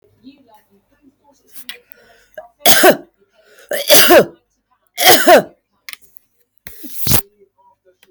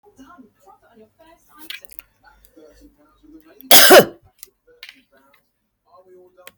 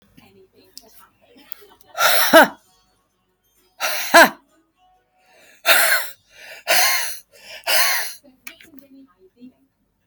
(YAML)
three_cough_length: 8.1 s
three_cough_amplitude: 32768
three_cough_signal_mean_std_ratio: 0.36
cough_length: 6.6 s
cough_amplitude: 32768
cough_signal_mean_std_ratio: 0.21
exhalation_length: 10.1 s
exhalation_amplitude: 32768
exhalation_signal_mean_std_ratio: 0.35
survey_phase: beta (2021-08-13 to 2022-03-07)
age: 45-64
gender: Female
wearing_mask: 'No'
symptom_none: true
smoker_status: Current smoker (e-cigarettes or vapes only)
respiratory_condition_asthma: false
respiratory_condition_other: false
recruitment_source: REACT
submission_delay: 2 days
covid_test_result: Negative
covid_test_method: RT-qPCR
influenza_a_test_result: Negative
influenza_b_test_result: Negative